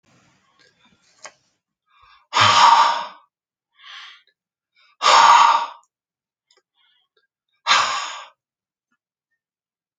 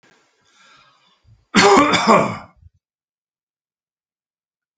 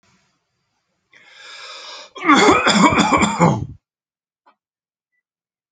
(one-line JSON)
{"exhalation_length": "10.0 s", "exhalation_amplitude": 31084, "exhalation_signal_mean_std_ratio": 0.33, "cough_length": "4.8 s", "cough_amplitude": 29949, "cough_signal_mean_std_ratio": 0.32, "three_cough_length": "5.7 s", "three_cough_amplitude": 29910, "three_cough_signal_mean_std_ratio": 0.41, "survey_phase": "alpha (2021-03-01 to 2021-08-12)", "age": "65+", "gender": "Male", "wearing_mask": "No", "symptom_none": true, "smoker_status": "Never smoked", "respiratory_condition_asthma": false, "respiratory_condition_other": false, "recruitment_source": "REACT", "submission_delay": "5 days", "covid_test_result": "Negative", "covid_test_method": "RT-qPCR"}